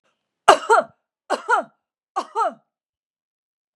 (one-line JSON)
{"three_cough_length": "3.8 s", "three_cough_amplitude": 32768, "three_cough_signal_mean_std_ratio": 0.3, "survey_phase": "beta (2021-08-13 to 2022-03-07)", "age": "65+", "gender": "Female", "wearing_mask": "No", "symptom_none": true, "smoker_status": "Never smoked", "respiratory_condition_asthma": false, "respiratory_condition_other": false, "recruitment_source": "REACT", "submission_delay": "1 day", "covid_test_result": "Negative", "covid_test_method": "RT-qPCR", "influenza_a_test_result": "Negative", "influenza_b_test_result": "Negative"}